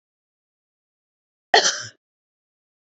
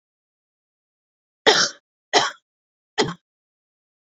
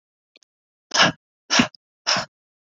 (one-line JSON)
{"cough_length": "2.8 s", "cough_amplitude": 28700, "cough_signal_mean_std_ratio": 0.2, "three_cough_length": "4.2 s", "three_cough_amplitude": 30074, "three_cough_signal_mean_std_ratio": 0.26, "exhalation_length": "2.6 s", "exhalation_amplitude": 25324, "exhalation_signal_mean_std_ratio": 0.33, "survey_phase": "beta (2021-08-13 to 2022-03-07)", "age": "45-64", "gender": "Female", "wearing_mask": "No", "symptom_shortness_of_breath": true, "smoker_status": "Never smoked", "respiratory_condition_asthma": false, "respiratory_condition_other": false, "recruitment_source": "REACT", "submission_delay": "1 day", "covid_test_result": "Negative", "covid_test_method": "RT-qPCR"}